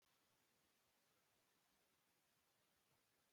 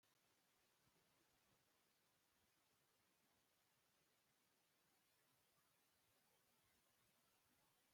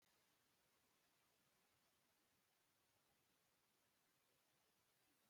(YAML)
cough_length: 3.3 s
cough_amplitude: 14
cough_signal_mean_std_ratio: 1.0
exhalation_length: 7.9 s
exhalation_amplitude: 13
exhalation_signal_mean_std_ratio: 1.01
three_cough_length: 5.3 s
three_cough_amplitude: 13
three_cough_signal_mean_std_ratio: 1.0
survey_phase: beta (2021-08-13 to 2022-03-07)
age: 65+
gender: Female
wearing_mask: 'No'
symptom_fatigue: true
symptom_onset: 7 days
smoker_status: Never smoked
respiratory_condition_asthma: false
respiratory_condition_other: false
recruitment_source: REACT
submission_delay: 3 days
covid_test_result: Negative
covid_test_method: RT-qPCR
influenza_a_test_result: Negative
influenza_b_test_result: Negative